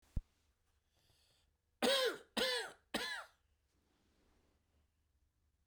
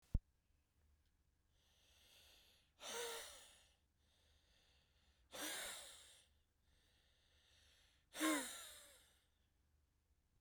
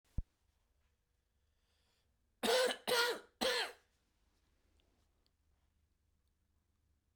{"three_cough_length": "5.7 s", "three_cough_amplitude": 3523, "three_cough_signal_mean_std_ratio": 0.33, "exhalation_length": "10.4 s", "exhalation_amplitude": 1929, "exhalation_signal_mean_std_ratio": 0.31, "cough_length": "7.2 s", "cough_amplitude": 3359, "cough_signal_mean_std_ratio": 0.3, "survey_phase": "beta (2021-08-13 to 2022-03-07)", "age": "45-64", "gender": "Male", "wearing_mask": "No", "symptom_cough_any": true, "symptom_runny_or_blocked_nose": true, "symptom_fatigue": true, "symptom_fever_high_temperature": true, "symptom_headache": true, "symptom_change_to_sense_of_smell_or_taste": true, "symptom_loss_of_taste": true, "symptom_onset": "3 days", "smoker_status": "Never smoked", "respiratory_condition_asthma": false, "respiratory_condition_other": false, "recruitment_source": "Test and Trace", "submission_delay": "1 day", "covid_test_result": "Positive", "covid_test_method": "RT-qPCR"}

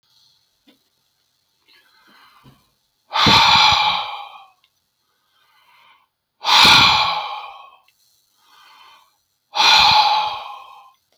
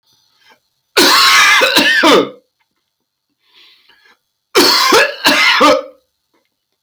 {"exhalation_length": "11.2 s", "exhalation_amplitude": 31287, "exhalation_signal_mean_std_ratio": 0.4, "cough_length": "6.8 s", "cough_amplitude": 32767, "cough_signal_mean_std_ratio": 0.56, "survey_phase": "beta (2021-08-13 to 2022-03-07)", "age": "65+", "gender": "Male", "wearing_mask": "No", "symptom_none": true, "smoker_status": "Ex-smoker", "respiratory_condition_asthma": false, "respiratory_condition_other": false, "recruitment_source": "REACT", "submission_delay": "1 day", "covid_test_result": "Negative", "covid_test_method": "RT-qPCR"}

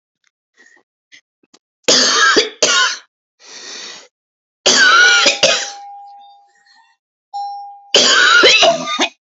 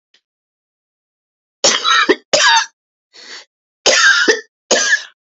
{"three_cough_length": "9.4 s", "three_cough_amplitude": 32768, "three_cough_signal_mean_std_ratio": 0.51, "cough_length": "5.4 s", "cough_amplitude": 32138, "cough_signal_mean_std_ratio": 0.46, "survey_phase": "beta (2021-08-13 to 2022-03-07)", "age": "18-44", "gender": "Female", "wearing_mask": "No", "symptom_runny_or_blocked_nose": true, "symptom_shortness_of_breath": true, "symptom_fatigue": true, "symptom_headache": true, "symptom_other": true, "symptom_onset": "10 days", "smoker_status": "Current smoker (11 or more cigarettes per day)", "respiratory_condition_asthma": false, "respiratory_condition_other": false, "recruitment_source": "REACT", "submission_delay": "2 days", "covid_test_result": "Negative", "covid_test_method": "RT-qPCR", "influenza_a_test_result": "Negative", "influenza_b_test_result": "Negative"}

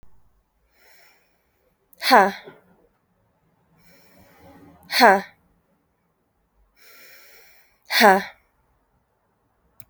{"exhalation_length": "9.9 s", "exhalation_amplitude": 28661, "exhalation_signal_mean_std_ratio": 0.23, "survey_phase": "alpha (2021-03-01 to 2021-08-12)", "age": "18-44", "gender": "Female", "wearing_mask": "No", "symptom_cough_any": true, "symptom_shortness_of_breath": true, "symptom_fatigue": true, "symptom_headache": true, "smoker_status": "Ex-smoker", "respiratory_condition_asthma": false, "respiratory_condition_other": false, "recruitment_source": "Test and Trace", "submission_delay": "2 days", "covid_test_result": "Positive", "covid_test_method": "RT-qPCR", "covid_ct_value": 21.2, "covid_ct_gene": "ORF1ab gene", "covid_ct_mean": 21.6, "covid_viral_load": "83000 copies/ml", "covid_viral_load_category": "Low viral load (10K-1M copies/ml)"}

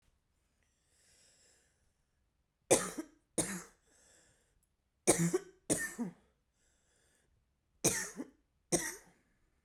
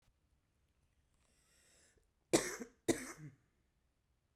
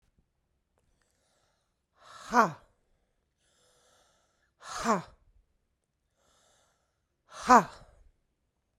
{"three_cough_length": "9.6 s", "three_cough_amplitude": 8356, "three_cough_signal_mean_std_ratio": 0.29, "cough_length": "4.4 s", "cough_amplitude": 4821, "cough_signal_mean_std_ratio": 0.22, "exhalation_length": "8.8 s", "exhalation_amplitude": 18674, "exhalation_signal_mean_std_ratio": 0.19, "survey_phase": "beta (2021-08-13 to 2022-03-07)", "age": "18-44", "gender": "Female", "wearing_mask": "No", "symptom_cough_any": true, "symptom_onset": "13 days", "smoker_status": "Current smoker (e-cigarettes or vapes only)", "respiratory_condition_asthma": true, "respiratory_condition_other": false, "recruitment_source": "REACT", "submission_delay": "4 days", "covid_test_result": "Negative", "covid_test_method": "RT-qPCR"}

